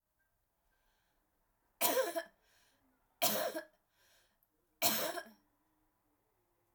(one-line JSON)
{"three_cough_length": "6.7 s", "three_cough_amplitude": 4726, "three_cough_signal_mean_std_ratio": 0.32, "survey_phase": "alpha (2021-03-01 to 2021-08-12)", "age": "45-64", "gender": "Female", "wearing_mask": "No", "symptom_fatigue": true, "symptom_headache": true, "smoker_status": "Never smoked", "respiratory_condition_asthma": false, "respiratory_condition_other": false, "recruitment_source": "REACT", "submission_delay": "2 days", "covid_test_result": "Negative", "covid_test_method": "RT-qPCR"}